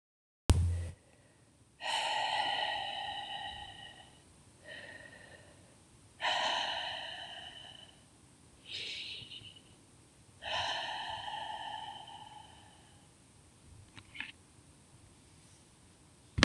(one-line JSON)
{"exhalation_length": "16.4 s", "exhalation_amplitude": 21269, "exhalation_signal_mean_std_ratio": 0.48, "survey_phase": "beta (2021-08-13 to 2022-03-07)", "age": "45-64", "gender": "Female", "wearing_mask": "No", "symptom_cough_any": true, "symptom_runny_or_blocked_nose": true, "symptom_fatigue": true, "symptom_change_to_sense_of_smell_or_taste": true, "symptom_loss_of_taste": true, "symptom_onset": "3 days", "smoker_status": "Never smoked", "respiratory_condition_asthma": false, "respiratory_condition_other": false, "recruitment_source": "Test and Trace", "submission_delay": "2 days", "covid_test_result": "Positive", "covid_test_method": "RT-qPCR", "covid_ct_value": 16.8, "covid_ct_gene": "ORF1ab gene", "covid_ct_mean": 17.9, "covid_viral_load": "1300000 copies/ml", "covid_viral_load_category": "High viral load (>1M copies/ml)"}